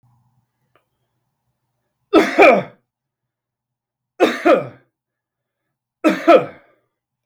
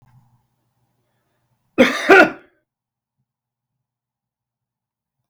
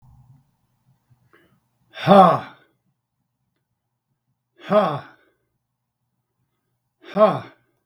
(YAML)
three_cough_length: 7.3 s
three_cough_amplitude: 32766
three_cough_signal_mean_std_ratio: 0.3
cough_length: 5.3 s
cough_amplitude: 32768
cough_signal_mean_std_ratio: 0.21
exhalation_length: 7.9 s
exhalation_amplitude: 32766
exhalation_signal_mean_std_ratio: 0.25
survey_phase: beta (2021-08-13 to 2022-03-07)
age: 65+
gender: Male
wearing_mask: 'No'
symptom_none: true
smoker_status: Ex-smoker
respiratory_condition_asthma: false
respiratory_condition_other: false
recruitment_source: REACT
submission_delay: 2 days
covid_test_result: Negative
covid_test_method: RT-qPCR
influenza_a_test_result: Negative
influenza_b_test_result: Negative